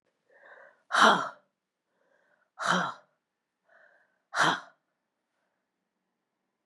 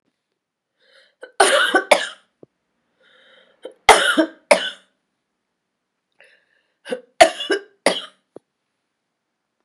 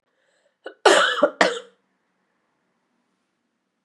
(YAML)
exhalation_length: 6.7 s
exhalation_amplitude: 16351
exhalation_signal_mean_std_ratio: 0.27
three_cough_length: 9.6 s
three_cough_amplitude: 32768
three_cough_signal_mean_std_ratio: 0.28
cough_length: 3.8 s
cough_amplitude: 32433
cough_signal_mean_std_ratio: 0.29
survey_phase: beta (2021-08-13 to 2022-03-07)
age: 45-64
gender: Female
wearing_mask: 'No'
symptom_cough_any: true
symptom_runny_or_blocked_nose: true
symptom_sore_throat: true
symptom_fatigue: true
symptom_headache: true
smoker_status: Ex-smoker
respiratory_condition_asthma: true
respiratory_condition_other: false
recruitment_source: Test and Trace
submission_delay: 2 days
covid_test_result: Positive
covid_test_method: ePCR